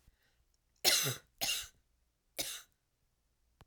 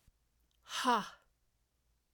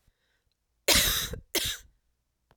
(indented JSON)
{
  "three_cough_length": "3.7 s",
  "three_cough_amplitude": 7439,
  "three_cough_signal_mean_std_ratio": 0.33,
  "exhalation_length": "2.1 s",
  "exhalation_amplitude": 3734,
  "exhalation_signal_mean_std_ratio": 0.3,
  "cough_length": "2.6 s",
  "cough_amplitude": 12221,
  "cough_signal_mean_std_ratio": 0.38,
  "survey_phase": "alpha (2021-03-01 to 2021-08-12)",
  "age": "45-64",
  "gender": "Female",
  "wearing_mask": "No",
  "symptom_cough_any": true,
  "symptom_fatigue": true,
  "symptom_headache": true,
  "symptom_change_to_sense_of_smell_or_taste": true,
  "symptom_loss_of_taste": true,
  "symptom_onset": "6 days",
  "smoker_status": "Ex-smoker",
  "respiratory_condition_asthma": false,
  "respiratory_condition_other": false,
  "recruitment_source": "Test and Trace",
  "submission_delay": "1 day",
  "covid_test_result": "Positive",
  "covid_test_method": "RT-qPCR",
  "covid_ct_value": 20.2,
  "covid_ct_gene": "ORF1ab gene",
  "covid_ct_mean": 21.2,
  "covid_viral_load": "110000 copies/ml",
  "covid_viral_load_category": "Low viral load (10K-1M copies/ml)"
}